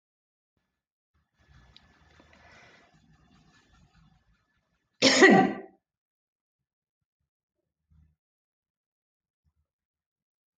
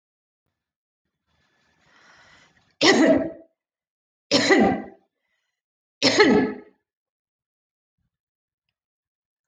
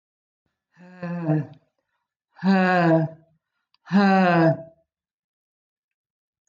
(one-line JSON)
{"cough_length": "10.6 s", "cough_amplitude": 19480, "cough_signal_mean_std_ratio": 0.17, "three_cough_length": "9.5 s", "three_cough_amplitude": 22132, "three_cough_signal_mean_std_ratio": 0.32, "exhalation_length": "6.5 s", "exhalation_amplitude": 15290, "exhalation_signal_mean_std_ratio": 0.44, "survey_phase": "alpha (2021-03-01 to 2021-08-12)", "age": "65+", "gender": "Female", "wearing_mask": "No", "symptom_abdominal_pain": true, "symptom_onset": "12 days", "smoker_status": "Never smoked", "respiratory_condition_asthma": false, "respiratory_condition_other": false, "recruitment_source": "REACT", "submission_delay": "1 day", "covid_test_result": "Negative", "covid_test_method": "RT-qPCR"}